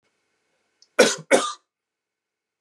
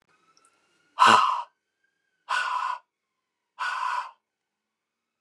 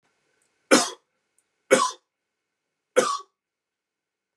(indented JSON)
{
  "cough_length": "2.6 s",
  "cough_amplitude": 26771,
  "cough_signal_mean_std_ratio": 0.26,
  "exhalation_length": "5.2 s",
  "exhalation_amplitude": 23852,
  "exhalation_signal_mean_std_ratio": 0.35,
  "three_cough_length": "4.4 s",
  "three_cough_amplitude": 27123,
  "three_cough_signal_mean_std_ratio": 0.26,
  "survey_phase": "beta (2021-08-13 to 2022-03-07)",
  "age": "45-64",
  "gender": "Male",
  "wearing_mask": "No",
  "symptom_none": true,
  "smoker_status": "Never smoked",
  "respiratory_condition_asthma": false,
  "respiratory_condition_other": false,
  "recruitment_source": "REACT",
  "submission_delay": "2 days",
  "covid_test_result": "Negative",
  "covid_test_method": "RT-qPCR",
  "influenza_a_test_result": "Negative",
  "influenza_b_test_result": "Negative"
}